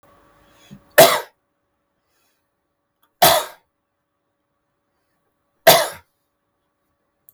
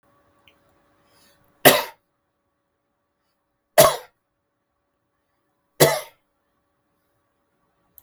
cough_length: 7.3 s
cough_amplitude: 32768
cough_signal_mean_std_ratio: 0.22
three_cough_length: 8.0 s
three_cough_amplitude: 32768
three_cough_signal_mean_std_ratio: 0.19
survey_phase: beta (2021-08-13 to 2022-03-07)
age: 65+
gender: Male
wearing_mask: 'No'
symptom_none: true
smoker_status: Never smoked
respiratory_condition_asthma: false
respiratory_condition_other: false
recruitment_source: REACT
submission_delay: 3 days
covid_test_result: Negative
covid_test_method: RT-qPCR
influenza_a_test_result: Negative
influenza_b_test_result: Negative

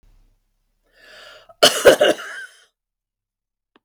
cough_length: 3.8 s
cough_amplitude: 32768
cough_signal_mean_std_ratio: 0.27
survey_phase: beta (2021-08-13 to 2022-03-07)
age: 65+
gender: Female
wearing_mask: 'No'
symptom_none: true
smoker_status: Never smoked
respiratory_condition_asthma: false
respiratory_condition_other: false
recruitment_source: Test and Trace
submission_delay: 2 days
covid_test_result: Negative
covid_test_method: RT-qPCR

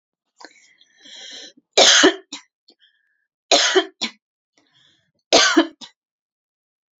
three_cough_length: 7.0 s
three_cough_amplitude: 32768
three_cough_signal_mean_std_ratio: 0.32
survey_phase: beta (2021-08-13 to 2022-03-07)
age: 45-64
gender: Female
wearing_mask: 'No'
symptom_diarrhoea: true
symptom_headache: true
smoker_status: Never smoked
respiratory_condition_asthma: false
respiratory_condition_other: false
recruitment_source: Test and Trace
submission_delay: 1 day
covid_test_result: Positive
covid_test_method: RT-qPCR
covid_ct_value: 30.2
covid_ct_gene: N gene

